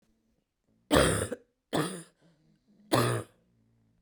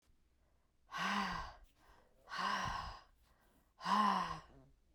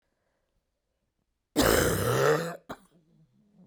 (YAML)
three_cough_length: 4.0 s
three_cough_amplitude: 13148
three_cough_signal_mean_std_ratio: 0.37
exhalation_length: 4.9 s
exhalation_amplitude: 2917
exhalation_signal_mean_std_ratio: 0.5
cough_length: 3.7 s
cough_amplitude: 12427
cough_signal_mean_std_ratio: 0.43
survey_phase: beta (2021-08-13 to 2022-03-07)
age: 18-44
gender: Female
wearing_mask: 'No'
symptom_cough_any: true
symptom_runny_or_blocked_nose: true
symptom_fatigue: true
symptom_change_to_sense_of_smell_or_taste: true
symptom_loss_of_taste: true
symptom_onset: 3 days
smoker_status: Never smoked
respiratory_condition_asthma: false
respiratory_condition_other: false
recruitment_source: Test and Trace
submission_delay: 2 days
covid_test_result: Positive
covid_test_method: RT-qPCR